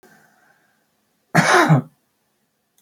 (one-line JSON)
{"cough_length": "2.8 s", "cough_amplitude": 26912, "cough_signal_mean_std_ratio": 0.33, "survey_phase": "beta (2021-08-13 to 2022-03-07)", "age": "65+", "gender": "Male", "wearing_mask": "No", "symptom_cough_any": true, "smoker_status": "Never smoked", "respiratory_condition_asthma": true, "respiratory_condition_other": false, "recruitment_source": "Test and Trace", "submission_delay": "2 days", "covid_test_result": "Positive", "covid_test_method": "ePCR"}